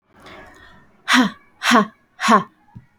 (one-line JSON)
{"exhalation_length": "3.0 s", "exhalation_amplitude": 28349, "exhalation_signal_mean_std_ratio": 0.4, "survey_phase": "beta (2021-08-13 to 2022-03-07)", "age": "18-44", "gender": "Female", "wearing_mask": "No", "symptom_none": true, "smoker_status": "Never smoked", "respiratory_condition_asthma": false, "respiratory_condition_other": false, "recruitment_source": "REACT", "submission_delay": "1 day", "covid_test_result": "Negative", "covid_test_method": "RT-qPCR"}